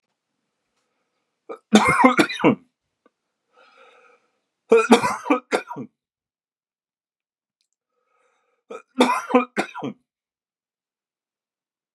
{"three_cough_length": "11.9 s", "three_cough_amplitude": 32768, "three_cough_signal_mean_std_ratio": 0.29, "survey_phase": "beta (2021-08-13 to 2022-03-07)", "age": "45-64", "gender": "Male", "wearing_mask": "No", "symptom_new_continuous_cough": true, "symptom_fatigue": true, "symptom_fever_high_temperature": true, "symptom_headache": true, "symptom_other": true, "symptom_onset": "2 days", "smoker_status": "Never smoked", "respiratory_condition_asthma": false, "respiratory_condition_other": false, "recruitment_source": "Test and Trace", "submission_delay": "2 days", "covid_test_result": "Positive", "covid_test_method": "RT-qPCR", "covid_ct_value": 26.7, "covid_ct_gene": "ORF1ab gene"}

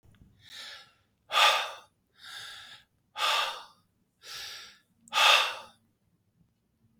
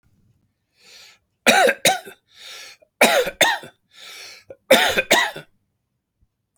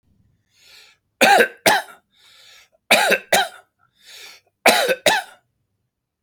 {"exhalation_length": "7.0 s", "exhalation_amplitude": 13881, "exhalation_signal_mean_std_ratio": 0.35, "three_cough_length": "6.6 s", "three_cough_amplitude": 32768, "three_cough_signal_mean_std_ratio": 0.38, "cough_length": "6.2 s", "cough_amplitude": 32678, "cough_signal_mean_std_ratio": 0.37, "survey_phase": "alpha (2021-03-01 to 2021-08-12)", "age": "65+", "gender": "Male", "wearing_mask": "No", "symptom_cough_any": true, "symptom_shortness_of_breath": true, "symptom_fatigue": true, "symptom_onset": "12 days", "smoker_status": "Never smoked", "respiratory_condition_asthma": false, "respiratory_condition_other": false, "recruitment_source": "REACT", "submission_delay": "5 days", "covid_test_result": "Negative", "covid_test_method": "RT-qPCR"}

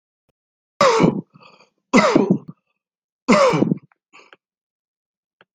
{"three_cough_length": "5.5 s", "three_cough_amplitude": 27720, "three_cough_signal_mean_std_ratio": 0.38, "survey_phase": "alpha (2021-03-01 to 2021-08-12)", "age": "45-64", "gender": "Male", "wearing_mask": "No", "symptom_none": true, "smoker_status": "Never smoked", "respiratory_condition_asthma": true, "respiratory_condition_other": false, "recruitment_source": "REACT", "submission_delay": "5 days", "covid_test_result": "Negative", "covid_test_method": "RT-qPCR"}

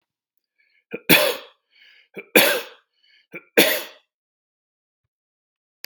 {"three_cough_length": "5.9 s", "three_cough_amplitude": 32768, "three_cough_signal_mean_std_ratio": 0.28, "survey_phase": "beta (2021-08-13 to 2022-03-07)", "age": "65+", "gender": "Male", "wearing_mask": "No", "symptom_none": true, "smoker_status": "Never smoked", "respiratory_condition_asthma": false, "respiratory_condition_other": false, "recruitment_source": "REACT", "submission_delay": "4 days", "covid_test_result": "Negative", "covid_test_method": "RT-qPCR"}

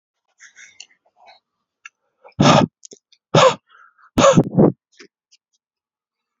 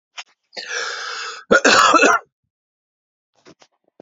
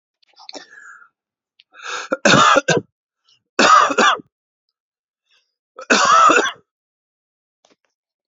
{"exhalation_length": "6.4 s", "exhalation_amplitude": 30480, "exhalation_signal_mean_std_ratio": 0.31, "cough_length": "4.0 s", "cough_amplitude": 29929, "cough_signal_mean_std_ratio": 0.4, "three_cough_length": "8.3 s", "three_cough_amplitude": 30811, "three_cough_signal_mean_std_ratio": 0.38, "survey_phase": "beta (2021-08-13 to 2022-03-07)", "age": "45-64", "gender": "Male", "wearing_mask": "No", "symptom_none": true, "symptom_onset": "9 days", "smoker_status": "Never smoked", "respiratory_condition_asthma": false, "respiratory_condition_other": false, "recruitment_source": "REACT", "submission_delay": "10 days", "covid_test_result": "Negative", "covid_test_method": "RT-qPCR"}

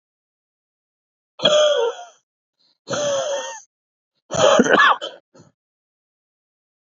{"exhalation_length": "6.9 s", "exhalation_amplitude": 27974, "exhalation_signal_mean_std_ratio": 0.4, "survey_phase": "beta (2021-08-13 to 2022-03-07)", "age": "18-44", "gender": "Male", "wearing_mask": "No", "symptom_sore_throat": true, "symptom_headache": true, "smoker_status": "Current smoker (e-cigarettes or vapes only)", "respiratory_condition_asthma": false, "respiratory_condition_other": false, "recruitment_source": "Test and Trace", "submission_delay": "1 day", "covid_test_result": "Positive", "covid_test_method": "RT-qPCR", "covid_ct_value": 33.0, "covid_ct_gene": "N gene"}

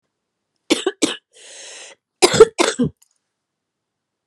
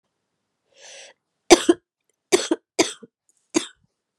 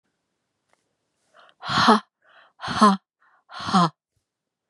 {"cough_length": "4.3 s", "cough_amplitude": 32768, "cough_signal_mean_std_ratio": 0.27, "three_cough_length": "4.2 s", "three_cough_amplitude": 32767, "three_cough_signal_mean_std_ratio": 0.22, "exhalation_length": "4.7 s", "exhalation_amplitude": 27168, "exhalation_signal_mean_std_ratio": 0.32, "survey_phase": "beta (2021-08-13 to 2022-03-07)", "age": "45-64", "gender": "Female", "wearing_mask": "No", "symptom_cough_any": true, "symptom_new_continuous_cough": true, "symptom_runny_or_blocked_nose": true, "symptom_shortness_of_breath": true, "symptom_abdominal_pain": true, "symptom_fatigue": true, "symptom_fever_high_temperature": true, "symptom_headache": true, "symptom_other": true, "symptom_onset": "3 days", "smoker_status": "Ex-smoker", "respiratory_condition_asthma": false, "respiratory_condition_other": false, "recruitment_source": "Test and Trace", "submission_delay": "1 day", "covid_test_result": "Positive", "covid_test_method": "RT-qPCR", "covid_ct_value": 22.8, "covid_ct_gene": "ORF1ab gene"}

